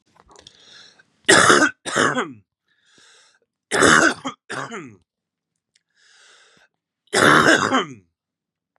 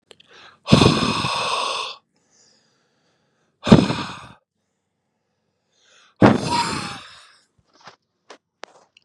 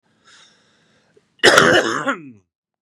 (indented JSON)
{
  "three_cough_length": "8.8 s",
  "three_cough_amplitude": 32631,
  "three_cough_signal_mean_std_ratio": 0.37,
  "exhalation_length": "9.0 s",
  "exhalation_amplitude": 32768,
  "exhalation_signal_mean_std_ratio": 0.32,
  "cough_length": "2.8 s",
  "cough_amplitude": 32768,
  "cough_signal_mean_std_ratio": 0.37,
  "survey_phase": "beta (2021-08-13 to 2022-03-07)",
  "age": "18-44",
  "gender": "Male",
  "wearing_mask": "No",
  "symptom_cough_any": true,
  "symptom_runny_or_blocked_nose": true,
  "symptom_abdominal_pain": true,
  "symptom_fatigue": true,
  "symptom_other": true,
  "smoker_status": "Ex-smoker",
  "respiratory_condition_asthma": false,
  "respiratory_condition_other": false,
  "recruitment_source": "Test and Trace",
  "submission_delay": "1 day",
  "covid_test_result": "Positive",
  "covid_test_method": "LFT"
}